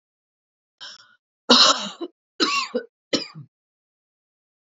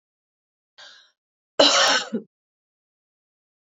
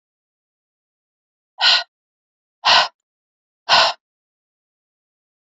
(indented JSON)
{
  "three_cough_length": "4.8 s",
  "three_cough_amplitude": 29124,
  "three_cough_signal_mean_std_ratio": 0.3,
  "cough_length": "3.7 s",
  "cough_amplitude": 28295,
  "cough_signal_mean_std_ratio": 0.29,
  "exhalation_length": "5.5 s",
  "exhalation_amplitude": 28531,
  "exhalation_signal_mean_std_ratio": 0.27,
  "survey_phase": "beta (2021-08-13 to 2022-03-07)",
  "age": "18-44",
  "gender": "Female",
  "wearing_mask": "No",
  "symptom_cough_any": true,
  "symptom_runny_or_blocked_nose": true,
  "symptom_shortness_of_breath": true,
  "symptom_sore_throat": true,
  "symptom_other": true,
  "symptom_onset": "3 days",
  "smoker_status": "Ex-smoker",
  "respiratory_condition_asthma": false,
  "respiratory_condition_other": false,
  "recruitment_source": "Test and Trace",
  "submission_delay": "2 days",
  "covid_test_result": "Positive",
  "covid_test_method": "RT-qPCR",
  "covid_ct_value": 21.9,
  "covid_ct_gene": "ORF1ab gene",
  "covid_ct_mean": 22.1,
  "covid_viral_load": "55000 copies/ml",
  "covid_viral_load_category": "Low viral load (10K-1M copies/ml)"
}